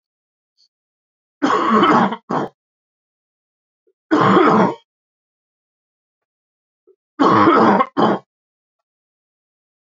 {"three_cough_length": "9.9 s", "three_cough_amplitude": 26975, "three_cough_signal_mean_std_ratio": 0.41, "survey_phase": "beta (2021-08-13 to 2022-03-07)", "age": "18-44", "gender": "Male", "wearing_mask": "No", "symptom_cough_any": true, "symptom_sore_throat": true, "symptom_onset": "2 days", "smoker_status": "Never smoked", "respiratory_condition_asthma": false, "respiratory_condition_other": false, "recruitment_source": "Test and Trace", "submission_delay": "1 day", "covid_test_result": "Positive", "covid_test_method": "RT-qPCR", "covid_ct_value": 20.7, "covid_ct_gene": "ORF1ab gene", "covid_ct_mean": 21.0, "covid_viral_load": "130000 copies/ml", "covid_viral_load_category": "Low viral load (10K-1M copies/ml)"}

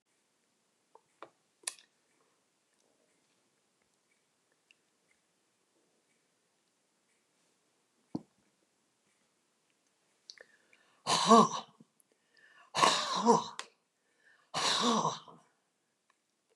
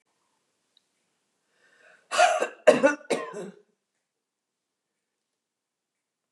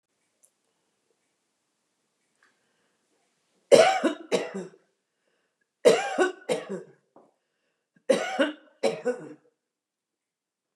{"exhalation_length": "16.6 s", "exhalation_amplitude": 10809, "exhalation_signal_mean_std_ratio": 0.24, "cough_length": "6.3 s", "cough_amplitude": 21898, "cough_signal_mean_std_ratio": 0.25, "three_cough_length": "10.8 s", "three_cough_amplitude": 25391, "three_cough_signal_mean_std_ratio": 0.29, "survey_phase": "beta (2021-08-13 to 2022-03-07)", "age": "65+", "gender": "Female", "wearing_mask": "No", "symptom_none": true, "smoker_status": "Never smoked", "respiratory_condition_asthma": false, "respiratory_condition_other": false, "recruitment_source": "REACT", "submission_delay": "3 days", "covid_test_result": "Negative", "covid_test_method": "RT-qPCR", "influenza_a_test_result": "Negative", "influenza_b_test_result": "Negative"}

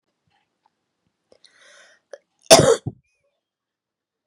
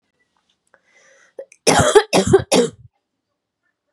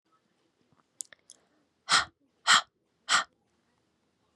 {"cough_length": "4.3 s", "cough_amplitude": 32768, "cough_signal_mean_std_ratio": 0.19, "three_cough_length": "3.9 s", "three_cough_amplitude": 32767, "three_cough_signal_mean_std_ratio": 0.35, "exhalation_length": "4.4 s", "exhalation_amplitude": 15723, "exhalation_signal_mean_std_ratio": 0.24, "survey_phase": "beta (2021-08-13 to 2022-03-07)", "age": "18-44", "gender": "Female", "wearing_mask": "No", "symptom_cough_any": true, "symptom_runny_or_blocked_nose": true, "symptom_shortness_of_breath": true, "symptom_fatigue": true, "symptom_change_to_sense_of_smell_or_taste": true, "symptom_onset": "3 days", "smoker_status": "Never smoked", "respiratory_condition_asthma": false, "respiratory_condition_other": false, "recruitment_source": "Test and Trace", "submission_delay": "2 days", "covid_test_result": "Positive", "covid_test_method": "RT-qPCR", "covid_ct_value": 22.9, "covid_ct_gene": "ORF1ab gene"}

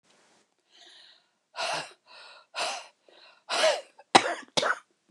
{"exhalation_length": "5.1 s", "exhalation_amplitude": 29016, "exhalation_signal_mean_std_ratio": 0.33, "survey_phase": "beta (2021-08-13 to 2022-03-07)", "age": "65+", "gender": "Female", "wearing_mask": "No", "symptom_none": true, "smoker_status": "Ex-smoker", "respiratory_condition_asthma": false, "respiratory_condition_other": false, "recruitment_source": "REACT", "submission_delay": "2 days", "covid_test_result": "Negative", "covid_test_method": "RT-qPCR", "influenza_a_test_result": "Negative", "influenza_b_test_result": "Negative"}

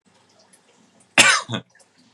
{"cough_length": "2.1 s", "cough_amplitude": 32768, "cough_signal_mean_std_ratio": 0.29, "survey_phase": "beta (2021-08-13 to 2022-03-07)", "age": "18-44", "gender": "Male", "wearing_mask": "No", "symptom_none": true, "smoker_status": "Never smoked", "respiratory_condition_asthma": true, "respiratory_condition_other": false, "recruitment_source": "REACT", "submission_delay": "0 days", "covid_test_result": "Negative", "covid_test_method": "RT-qPCR", "influenza_a_test_result": "Unknown/Void", "influenza_b_test_result": "Unknown/Void"}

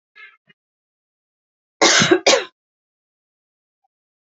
{"cough_length": "4.3 s", "cough_amplitude": 32767, "cough_signal_mean_std_ratio": 0.28, "survey_phase": "beta (2021-08-13 to 2022-03-07)", "age": "18-44", "gender": "Female", "wearing_mask": "No", "symptom_none": true, "symptom_onset": "12 days", "smoker_status": "Never smoked", "respiratory_condition_asthma": true, "respiratory_condition_other": false, "recruitment_source": "REACT", "submission_delay": "1 day", "covid_test_result": "Negative", "covid_test_method": "RT-qPCR", "influenza_a_test_result": "Unknown/Void", "influenza_b_test_result": "Unknown/Void"}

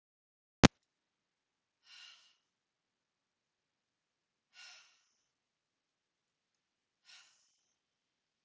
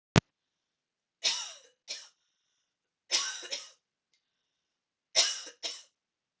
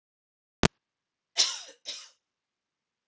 {"exhalation_length": "8.4 s", "exhalation_amplitude": 30786, "exhalation_signal_mean_std_ratio": 0.05, "three_cough_length": "6.4 s", "three_cough_amplitude": 32722, "three_cough_signal_mean_std_ratio": 0.26, "cough_length": "3.1 s", "cough_amplitude": 31908, "cough_signal_mean_std_ratio": 0.19, "survey_phase": "alpha (2021-03-01 to 2021-08-12)", "age": "18-44", "gender": "Female", "wearing_mask": "No", "symptom_none": true, "smoker_status": "Never smoked", "respiratory_condition_asthma": false, "respiratory_condition_other": false, "recruitment_source": "REACT", "submission_delay": "1 day", "covid_test_result": "Negative", "covid_test_method": "RT-qPCR"}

